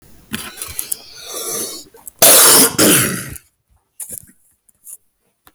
cough_length: 5.5 s
cough_amplitude: 32768
cough_signal_mean_std_ratio: 0.43
survey_phase: beta (2021-08-13 to 2022-03-07)
age: 45-64
gender: Male
wearing_mask: 'No'
symptom_cough_any: true
symptom_other: true
smoker_status: Current smoker (11 or more cigarettes per day)
respiratory_condition_asthma: false
respiratory_condition_other: false
recruitment_source: REACT
submission_delay: 1 day
covid_test_result: Negative
covid_test_method: RT-qPCR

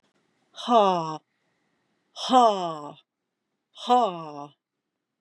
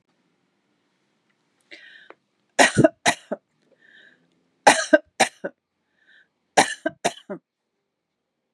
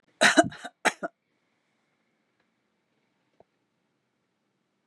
exhalation_length: 5.2 s
exhalation_amplitude: 17997
exhalation_signal_mean_std_ratio: 0.37
three_cough_length: 8.5 s
three_cough_amplitude: 32767
three_cough_signal_mean_std_ratio: 0.23
cough_length: 4.9 s
cough_amplitude: 21712
cough_signal_mean_std_ratio: 0.19
survey_phase: beta (2021-08-13 to 2022-03-07)
age: 65+
gender: Female
wearing_mask: 'No'
symptom_none: true
symptom_onset: 13 days
smoker_status: Never smoked
respiratory_condition_asthma: false
respiratory_condition_other: false
recruitment_source: REACT
submission_delay: 1 day
covid_test_result: Negative
covid_test_method: RT-qPCR
influenza_a_test_result: Negative
influenza_b_test_result: Negative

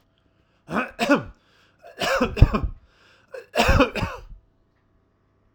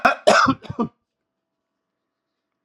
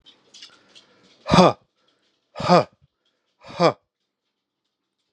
three_cough_length: 5.5 s
three_cough_amplitude: 32768
three_cough_signal_mean_std_ratio: 0.38
cough_length: 2.6 s
cough_amplitude: 31575
cough_signal_mean_std_ratio: 0.33
exhalation_length: 5.1 s
exhalation_amplitude: 32717
exhalation_signal_mean_std_ratio: 0.25
survey_phase: alpha (2021-03-01 to 2021-08-12)
age: 65+
gender: Male
wearing_mask: 'No'
symptom_none: true
smoker_status: Never smoked
respiratory_condition_asthma: false
respiratory_condition_other: false
recruitment_source: REACT
submission_delay: 3 days
covid_test_result: Negative
covid_test_method: RT-qPCR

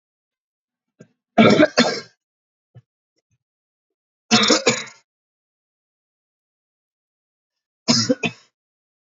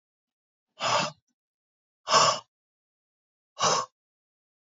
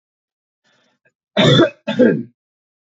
three_cough_length: 9.0 s
three_cough_amplitude: 31291
three_cough_signal_mean_std_ratio: 0.28
exhalation_length: 4.7 s
exhalation_amplitude: 13706
exhalation_signal_mean_std_ratio: 0.32
cough_length: 3.0 s
cough_amplitude: 28192
cough_signal_mean_std_ratio: 0.37
survey_phase: beta (2021-08-13 to 2022-03-07)
age: 18-44
gender: Male
wearing_mask: 'No'
symptom_cough_any: true
symptom_runny_or_blocked_nose: true
symptom_sore_throat: true
symptom_fatigue: true
symptom_headache: true
symptom_onset: 5 days
smoker_status: Never smoked
respiratory_condition_asthma: true
respiratory_condition_other: false
recruitment_source: Test and Trace
submission_delay: 1 day
covid_test_result: Positive
covid_test_method: RT-qPCR
covid_ct_value: 17.4
covid_ct_gene: ORF1ab gene
covid_ct_mean: 18.2
covid_viral_load: 1000000 copies/ml
covid_viral_load_category: High viral load (>1M copies/ml)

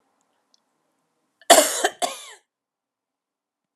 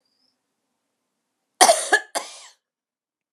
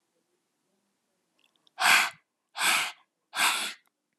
cough_length: 3.8 s
cough_amplitude: 32511
cough_signal_mean_std_ratio: 0.23
three_cough_length: 3.3 s
three_cough_amplitude: 32621
three_cough_signal_mean_std_ratio: 0.24
exhalation_length: 4.2 s
exhalation_amplitude: 15747
exhalation_signal_mean_std_ratio: 0.37
survey_phase: alpha (2021-03-01 to 2021-08-12)
age: 45-64
gender: Female
wearing_mask: 'No'
symptom_none: true
smoker_status: Never smoked
respiratory_condition_asthma: false
respiratory_condition_other: false
recruitment_source: REACT
submission_delay: 1 day
covid_test_result: Negative
covid_test_method: RT-qPCR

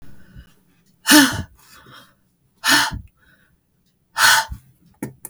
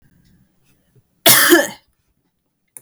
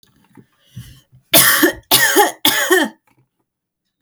exhalation_length: 5.3 s
exhalation_amplitude: 32768
exhalation_signal_mean_std_ratio: 0.34
cough_length: 2.8 s
cough_amplitude: 32768
cough_signal_mean_std_ratio: 0.31
three_cough_length: 4.0 s
three_cough_amplitude: 32768
three_cough_signal_mean_std_ratio: 0.46
survey_phase: beta (2021-08-13 to 2022-03-07)
age: 18-44
gender: Female
wearing_mask: 'No'
symptom_runny_or_blocked_nose: true
symptom_sore_throat: true
symptom_onset: 7 days
smoker_status: Never smoked
respiratory_condition_asthma: false
respiratory_condition_other: false
recruitment_source: REACT
submission_delay: 7 days
covid_test_result: Positive
covid_test_method: RT-qPCR
covid_ct_value: 18.9
covid_ct_gene: E gene
influenza_a_test_result: Negative
influenza_b_test_result: Negative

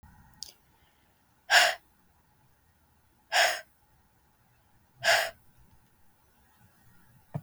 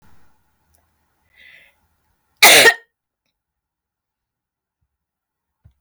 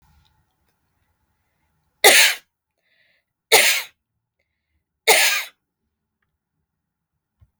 exhalation_length: 7.4 s
exhalation_amplitude: 15105
exhalation_signal_mean_std_ratio: 0.26
cough_length: 5.8 s
cough_amplitude: 32768
cough_signal_mean_std_ratio: 0.2
three_cough_length: 7.6 s
three_cough_amplitude: 32768
three_cough_signal_mean_std_ratio: 0.27
survey_phase: beta (2021-08-13 to 2022-03-07)
age: 45-64
gender: Female
wearing_mask: 'No'
symptom_cough_any: true
smoker_status: Never smoked
respiratory_condition_asthma: false
respiratory_condition_other: false
recruitment_source: REACT
submission_delay: 1 day
covid_test_result: Negative
covid_test_method: RT-qPCR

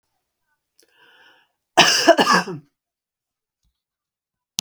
cough_length: 4.6 s
cough_amplitude: 32768
cough_signal_mean_std_ratio: 0.28
survey_phase: beta (2021-08-13 to 2022-03-07)
age: 45-64
gender: Female
wearing_mask: 'No'
symptom_none: true
smoker_status: Ex-smoker
respiratory_condition_asthma: false
respiratory_condition_other: false
recruitment_source: REACT
submission_delay: 2 days
covid_test_result: Negative
covid_test_method: RT-qPCR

